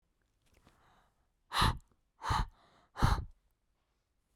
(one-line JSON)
{"exhalation_length": "4.4 s", "exhalation_amplitude": 6899, "exhalation_signal_mean_std_ratio": 0.32, "survey_phase": "beta (2021-08-13 to 2022-03-07)", "age": "18-44", "gender": "Female", "wearing_mask": "No", "symptom_cough_any": true, "symptom_new_continuous_cough": true, "symptom_runny_or_blocked_nose": true, "symptom_shortness_of_breath": true, "symptom_sore_throat": true, "symptom_fatigue": true, "symptom_headache": true, "symptom_other": true, "symptom_onset": "5 days", "smoker_status": "Never smoked", "respiratory_condition_asthma": false, "respiratory_condition_other": false, "recruitment_source": "Test and Trace", "submission_delay": "2 days", "covid_test_result": "Positive", "covid_test_method": "RT-qPCR", "covid_ct_value": 28.9, "covid_ct_gene": "N gene", "covid_ct_mean": 29.2, "covid_viral_load": "270 copies/ml", "covid_viral_load_category": "Minimal viral load (< 10K copies/ml)"}